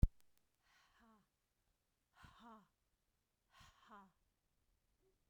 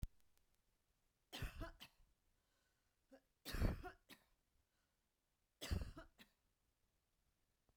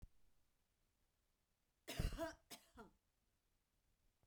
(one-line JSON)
{"exhalation_length": "5.3 s", "exhalation_amplitude": 4334, "exhalation_signal_mean_std_ratio": 0.11, "three_cough_length": "7.8 s", "three_cough_amplitude": 1371, "three_cough_signal_mean_std_ratio": 0.29, "cough_length": "4.3 s", "cough_amplitude": 1172, "cough_signal_mean_std_ratio": 0.28, "survey_phase": "beta (2021-08-13 to 2022-03-07)", "age": "45-64", "gender": "Female", "wearing_mask": "No", "symptom_none": true, "smoker_status": "Never smoked", "respiratory_condition_asthma": false, "respiratory_condition_other": false, "recruitment_source": "REACT", "submission_delay": "3 days", "covid_test_result": "Negative", "covid_test_method": "RT-qPCR"}